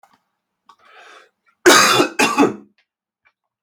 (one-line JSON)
{"cough_length": "3.6 s", "cough_amplitude": 32768, "cough_signal_mean_std_ratio": 0.36, "survey_phase": "beta (2021-08-13 to 2022-03-07)", "age": "18-44", "gender": "Male", "wearing_mask": "No", "symptom_cough_any": true, "symptom_runny_or_blocked_nose": true, "symptom_fatigue": true, "symptom_change_to_sense_of_smell_or_taste": true, "symptom_onset": "2 days", "smoker_status": "Never smoked", "respiratory_condition_asthma": false, "respiratory_condition_other": false, "recruitment_source": "Test and Trace", "submission_delay": "1 day", "covid_test_result": "Positive", "covid_test_method": "RT-qPCR", "covid_ct_value": 13.4, "covid_ct_gene": "ORF1ab gene", "covid_ct_mean": 13.9, "covid_viral_load": "28000000 copies/ml", "covid_viral_load_category": "High viral load (>1M copies/ml)"}